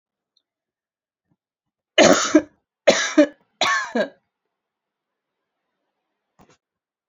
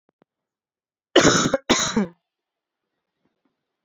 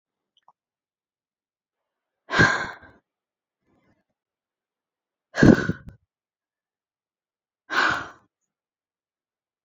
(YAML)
three_cough_length: 7.1 s
three_cough_amplitude: 28080
three_cough_signal_mean_std_ratio: 0.28
cough_length: 3.8 s
cough_amplitude: 28595
cough_signal_mean_std_ratio: 0.32
exhalation_length: 9.6 s
exhalation_amplitude: 27461
exhalation_signal_mean_std_ratio: 0.21
survey_phase: beta (2021-08-13 to 2022-03-07)
age: 18-44
gender: Female
wearing_mask: 'No'
symptom_none: true
smoker_status: Never smoked
respiratory_condition_asthma: false
respiratory_condition_other: false
recruitment_source: REACT
submission_delay: 0 days
covid_test_result: Negative
covid_test_method: RT-qPCR